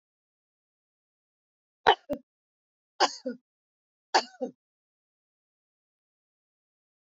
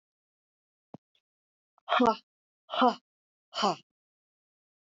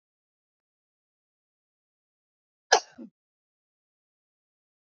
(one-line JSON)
{"three_cough_length": "7.1 s", "three_cough_amplitude": 17774, "three_cough_signal_mean_std_ratio": 0.16, "exhalation_length": "4.9 s", "exhalation_amplitude": 9665, "exhalation_signal_mean_std_ratio": 0.26, "cough_length": "4.9 s", "cough_amplitude": 26182, "cough_signal_mean_std_ratio": 0.1, "survey_phase": "beta (2021-08-13 to 2022-03-07)", "age": "45-64", "gender": "Female", "wearing_mask": "No", "symptom_none": true, "smoker_status": "Never smoked", "respiratory_condition_asthma": false, "respiratory_condition_other": false, "recruitment_source": "REACT", "submission_delay": "0 days", "covid_test_result": "Negative", "covid_test_method": "RT-qPCR", "influenza_a_test_result": "Negative", "influenza_b_test_result": "Negative"}